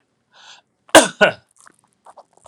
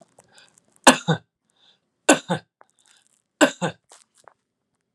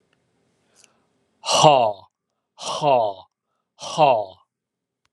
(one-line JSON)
{"cough_length": "2.5 s", "cough_amplitude": 32768, "cough_signal_mean_std_ratio": 0.23, "three_cough_length": "4.9 s", "three_cough_amplitude": 32768, "three_cough_signal_mean_std_ratio": 0.22, "exhalation_length": "5.1 s", "exhalation_amplitude": 32411, "exhalation_signal_mean_std_ratio": 0.37, "survey_phase": "beta (2021-08-13 to 2022-03-07)", "age": "45-64", "gender": "Male", "wearing_mask": "No", "symptom_none": true, "smoker_status": "Ex-smoker", "respiratory_condition_asthma": false, "respiratory_condition_other": false, "recruitment_source": "REACT", "submission_delay": "3 days", "covid_test_result": "Negative", "covid_test_method": "RT-qPCR", "influenza_a_test_result": "Negative", "influenza_b_test_result": "Negative"}